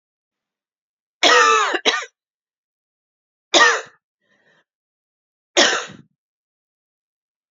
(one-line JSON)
{"three_cough_length": "7.5 s", "three_cough_amplitude": 30393, "three_cough_signal_mean_std_ratio": 0.32, "survey_phase": "beta (2021-08-13 to 2022-03-07)", "age": "18-44", "gender": "Female", "wearing_mask": "No", "symptom_cough_any": true, "symptom_headache": true, "symptom_change_to_sense_of_smell_or_taste": true, "symptom_loss_of_taste": true, "symptom_other": true, "smoker_status": "Never smoked", "respiratory_condition_asthma": false, "respiratory_condition_other": false, "recruitment_source": "Test and Trace", "submission_delay": "3 days", "covid_test_result": "Positive", "covid_test_method": "ePCR"}